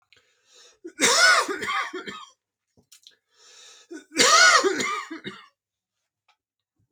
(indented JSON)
{
  "cough_length": "6.9 s",
  "cough_amplitude": 23407,
  "cough_signal_mean_std_ratio": 0.4,
  "survey_phase": "beta (2021-08-13 to 2022-03-07)",
  "age": "18-44",
  "gender": "Male",
  "wearing_mask": "No",
  "symptom_none": true,
  "smoker_status": "Ex-smoker",
  "respiratory_condition_asthma": false,
  "respiratory_condition_other": false,
  "recruitment_source": "REACT",
  "submission_delay": "8 days",
  "covid_test_method": "RT-qPCR"
}